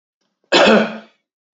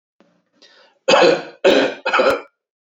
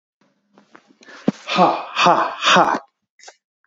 {"cough_length": "1.5 s", "cough_amplitude": 30365, "cough_signal_mean_std_ratio": 0.43, "three_cough_length": "2.9 s", "three_cough_amplitude": 28231, "three_cough_signal_mean_std_ratio": 0.48, "exhalation_length": "3.7 s", "exhalation_amplitude": 27928, "exhalation_signal_mean_std_ratio": 0.44, "survey_phase": "beta (2021-08-13 to 2022-03-07)", "age": "45-64", "gender": "Male", "wearing_mask": "No", "symptom_none": true, "symptom_onset": "5 days", "smoker_status": "Ex-smoker", "respiratory_condition_asthma": false, "respiratory_condition_other": false, "recruitment_source": "REACT", "submission_delay": "0 days", "covid_test_result": "Negative", "covid_test_method": "RT-qPCR", "covid_ct_value": 38.0, "covid_ct_gene": "N gene", "influenza_a_test_result": "Negative", "influenza_b_test_result": "Negative"}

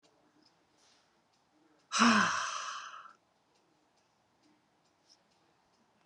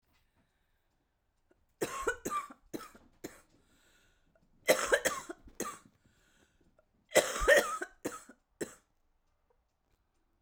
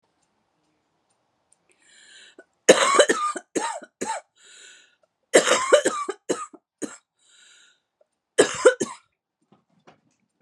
{"exhalation_length": "6.1 s", "exhalation_amplitude": 7915, "exhalation_signal_mean_std_ratio": 0.28, "three_cough_length": "10.4 s", "three_cough_amplitude": 12296, "three_cough_signal_mean_std_ratio": 0.29, "cough_length": "10.4 s", "cough_amplitude": 32203, "cough_signal_mean_std_ratio": 0.31, "survey_phase": "beta (2021-08-13 to 2022-03-07)", "age": "45-64", "gender": "Female", "wearing_mask": "No", "symptom_cough_any": true, "symptom_runny_or_blocked_nose": true, "symptom_sore_throat": true, "symptom_abdominal_pain": true, "symptom_fatigue": true, "symptom_headache": true, "symptom_change_to_sense_of_smell_or_taste": true, "symptom_other": true, "symptom_onset": "3 days", "smoker_status": "Never smoked", "respiratory_condition_asthma": false, "respiratory_condition_other": true, "recruitment_source": "Test and Trace", "submission_delay": "2 days", "covid_test_result": "Positive", "covid_test_method": "RT-qPCR", "covid_ct_value": 21.1, "covid_ct_gene": "ORF1ab gene", "covid_ct_mean": 21.2, "covid_viral_load": "110000 copies/ml", "covid_viral_load_category": "Low viral load (10K-1M copies/ml)"}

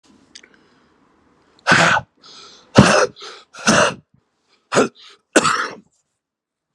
{"exhalation_length": "6.7 s", "exhalation_amplitude": 32768, "exhalation_signal_mean_std_ratio": 0.36, "survey_phase": "beta (2021-08-13 to 2022-03-07)", "age": "45-64", "gender": "Male", "wearing_mask": "No", "symptom_cough_any": true, "symptom_shortness_of_breath": true, "symptom_fatigue": true, "smoker_status": "Current smoker (11 or more cigarettes per day)", "respiratory_condition_asthma": false, "respiratory_condition_other": false, "recruitment_source": "Test and Trace", "submission_delay": "1 day", "covid_test_result": "Negative", "covid_test_method": "RT-qPCR"}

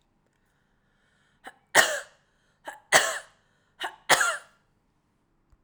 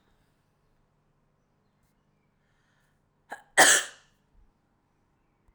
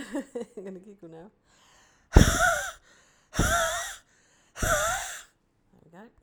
{"three_cough_length": "5.6 s", "three_cough_amplitude": 30785, "three_cough_signal_mean_std_ratio": 0.27, "cough_length": "5.5 s", "cough_amplitude": 19579, "cough_signal_mean_std_ratio": 0.18, "exhalation_length": "6.2 s", "exhalation_amplitude": 27232, "exhalation_signal_mean_std_ratio": 0.39, "survey_phase": "alpha (2021-03-01 to 2021-08-12)", "age": "45-64", "gender": "Female", "wearing_mask": "No", "symptom_none": true, "smoker_status": "Never smoked", "respiratory_condition_asthma": false, "respiratory_condition_other": false, "recruitment_source": "REACT", "submission_delay": "1 day", "covid_test_result": "Negative", "covid_test_method": "RT-qPCR"}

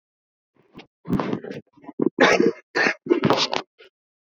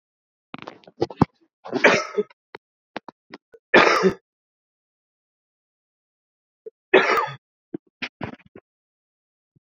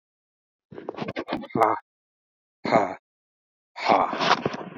{"cough_length": "4.3 s", "cough_amplitude": 27436, "cough_signal_mean_std_ratio": 0.43, "three_cough_length": "9.7 s", "three_cough_amplitude": 30174, "three_cough_signal_mean_std_ratio": 0.27, "exhalation_length": "4.8 s", "exhalation_amplitude": 24160, "exhalation_signal_mean_std_ratio": 0.41, "survey_phase": "beta (2021-08-13 to 2022-03-07)", "age": "18-44", "gender": "Male", "wearing_mask": "No", "symptom_cough_any": true, "symptom_runny_or_blocked_nose": true, "symptom_shortness_of_breath": true, "symptom_sore_throat": true, "symptom_diarrhoea": true, "symptom_fatigue": true, "symptom_fever_high_temperature": true, "symptom_headache": true, "smoker_status": "Ex-smoker", "respiratory_condition_asthma": true, "respiratory_condition_other": false, "recruitment_source": "Test and Trace", "submission_delay": "2 days", "covid_test_result": "Positive", "covid_test_method": "RT-qPCR", "covid_ct_value": 34.1, "covid_ct_gene": "N gene"}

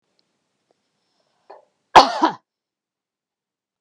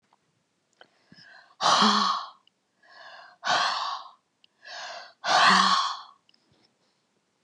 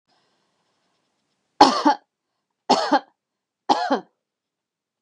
{"cough_length": "3.8 s", "cough_amplitude": 32768, "cough_signal_mean_std_ratio": 0.18, "exhalation_length": "7.4 s", "exhalation_amplitude": 15293, "exhalation_signal_mean_std_ratio": 0.42, "three_cough_length": "5.0 s", "three_cough_amplitude": 32768, "three_cough_signal_mean_std_ratio": 0.28, "survey_phase": "beta (2021-08-13 to 2022-03-07)", "age": "65+", "gender": "Female", "wearing_mask": "No", "symptom_none": true, "smoker_status": "Never smoked", "respiratory_condition_asthma": false, "respiratory_condition_other": false, "recruitment_source": "REACT", "submission_delay": "2 days", "covid_test_result": "Negative", "covid_test_method": "RT-qPCR", "influenza_a_test_result": "Negative", "influenza_b_test_result": "Negative"}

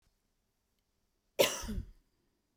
{"cough_length": "2.6 s", "cough_amplitude": 7913, "cough_signal_mean_std_ratio": 0.26, "survey_phase": "beta (2021-08-13 to 2022-03-07)", "age": "45-64", "gender": "Female", "wearing_mask": "No", "symptom_none": true, "smoker_status": "Ex-smoker", "respiratory_condition_asthma": true, "respiratory_condition_other": false, "recruitment_source": "REACT", "submission_delay": "1 day", "covid_test_result": "Negative", "covid_test_method": "RT-qPCR"}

